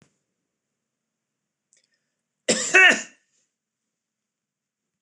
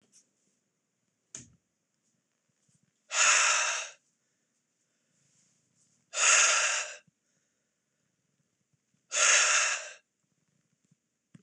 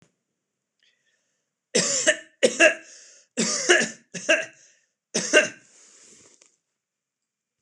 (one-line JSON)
{"cough_length": "5.0 s", "cough_amplitude": 24031, "cough_signal_mean_std_ratio": 0.22, "exhalation_length": "11.4 s", "exhalation_amplitude": 11344, "exhalation_signal_mean_std_ratio": 0.35, "three_cough_length": "7.6 s", "three_cough_amplitude": 25504, "three_cough_signal_mean_std_ratio": 0.34, "survey_phase": "beta (2021-08-13 to 2022-03-07)", "age": "18-44", "gender": "Male", "wearing_mask": "No", "symptom_none": true, "smoker_status": "Never smoked", "respiratory_condition_asthma": false, "respiratory_condition_other": false, "recruitment_source": "REACT", "submission_delay": "4 days", "covid_test_result": "Negative", "covid_test_method": "RT-qPCR", "influenza_a_test_result": "Negative", "influenza_b_test_result": "Negative"}